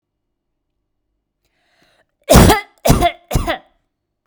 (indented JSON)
{
  "cough_length": "4.3 s",
  "cough_amplitude": 32768,
  "cough_signal_mean_std_ratio": 0.32,
  "survey_phase": "beta (2021-08-13 to 2022-03-07)",
  "age": "45-64",
  "gender": "Female",
  "wearing_mask": "No",
  "symptom_change_to_sense_of_smell_or_taste": true,
  "symptom_onset": "12 days",
  "smoker_status": "Never smoked",
  "respiratory_condition_asthma": false,
  "respiratory_condition_other": false,
  "recruitment_source": "REACT",
  "submission_delay": "6 days",
  "covid_test_result": "Negative",
  "covid_test_method": "RT-qPCR",
  "influenza_a_test_result": "Negative",
  "influenza_b_test_result": "Negative"
}